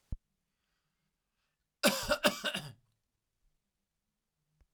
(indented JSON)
{
  "cough_length": "4.7 s",
  "cough_amplitude": 7776,
  "cough_signal_mean_std_ratio": 0.26,
  "survey_phase": "alpha (2021-03-01 to 2021-08-12)",
  "age": "45-64",
  "gender": "Male",
  "wearing_mask": "No",
  "symptom_none": true,
  "smoker_status": "Ex-smoker",
  "respiratory_condition_asthma": false,
  "respiratory_condition_other": false,
  "recruitment_source": "REACT",
  "submission_delay": "2 days",
  "covid_test_result": "Negative",
  "covid_test_method": "RT-qPCR"
}